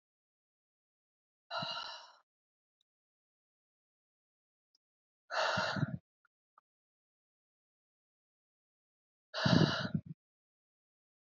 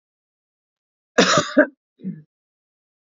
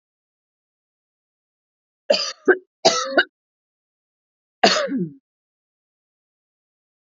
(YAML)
exhalation_length: 11.3 s
exhalation_amplitude: 6778
exhalation_signal_mean_std_ratio: 0.26
cough_length: 3.2 s
cough_amplitude: 27522
cough_signal_mean_std_ratio: 0.28
three_cough_length: 7.2 s
three_cough_amplitude: 28742
three_cough_signal_mean_std_ratio: 0.27
survey_phase: beta (2021-08-13 to 2022-03-07)
age: 18-44
gender: Female
wearing_mask: 'No'
symptom_abdominal_pain: true
symptom_diarrhoea: true
smoker_status: Ex-smoker
respiratory_condition_asthma: false
respiratory_condition_other: false
recruitment_source: REACT
submission_delay: 6 days
covid_test_result: Positive
covid_test_method: RT-qPCR
covid_ct_value: 36.0
covid_ct_gene: N gene
influenza_a_test_result: Negative
influenza_b_test_result: Negative